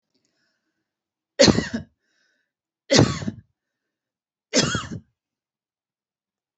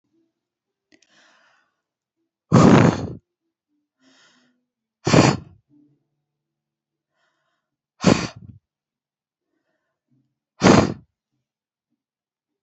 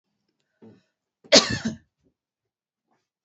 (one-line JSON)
{"three_cough_length": "6.6 s", "three_cough_amplitude": 28505, "three_cough_signal_mean_std_ratio": 0.27, "exhalation_length": "12.6 s", "exhalation_amplitude": 28555, "exhalation_signal_mean_std_ratio": 0.24, "cough_length": "3.2 s", "cough_amplitude": 32767, "cough_signal_mean_std_ratio": 0.2, "survey_phase": "beta (2021-08-13 to 2022-03-07)", "age": "45-64", "gender": "Female", "wearing_mask": "No", "symptom_shortness_of_breath": true, "symptom_sore_throat": true, "symptom_diarrhoea": true, "symptom_fatigue": true, "symptom_headache": true, "smoker_status": "Ex-smoker", "respiratory_condition_asthma": false, "respiratory_condition_other": false, "recruitment_source": "Test and Trace", "submission_delay": "2 days", "covid_test_result": "Positive", "covid_test_method": "RT-qPCR", "covid_ct_value": 34.8, "covid_ct_gene": "N gene"}